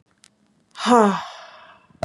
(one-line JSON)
{"exhalation_length": "2.0 s", "exhalation_amplitude": 28007, "exhalation_signal_mean_std_ratio": 0.35, "survey_phase": "beta (2021-08-13 to 2022-03-07)", "age": "18-44", "gender": "Female", "wearing_mask": "No", "symptom_runny_or_blocked_nose": true, "symptom_fatigue": true, "symptom_headache": true, "symptom_change_to_sense_of_smell_or_taste": true, "symptom_onset": "3 days", "smoker_status": "Never smoked", "respiratory_condition_asthma": false, "respiratory_condition_other": false, "recruitment_source": "Test and Trace", "submission_delay": "2 days", "covid_test_result": "Positive", "covid_test_method": "RT-qPCR", "covid_ct_value": 21.7, "covid_ct_gene": "N gene"}